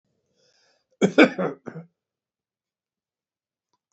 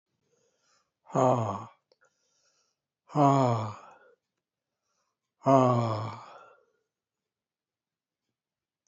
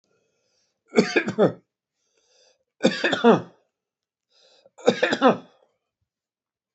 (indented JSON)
{
  "cough_length": "3.9 s",
  "cough_amplitude": 27075,
  "cough_signal_mean_std_ratio": 0.21,
  "exhalation_length": "8.9 s",
  "exhalation_amplitude": 13285,
  "exhalation_signal_mean_std_ratio": 0.33,
  "three_cough_length": "6.7 s",
  "three_cough_amplitude": 24523,
  "three_cough_signal_mean_std_ratio": 0.32,
  "survey_phase": "beta (2021-08-13 to 2022-03-07)",
  "age": "65+",
  "gender": "Male",
  "wearing_mask": "No",
  "symptom_runny_or_blocked_nose": true,
  "smoker_status": "Never smoked",
  "respiratory_condition_asthma": false,
  "respiratory_condition_other": false,
  "recruitment_source": "REACT",
  "submission_delay": "1 day",
  "covid_test_result": "Negative",
  "covid_test_method": "RT-qPCR",
  "influenza_a_test_result": "Negative",
  "influenza_b_test_result": "Negative"
}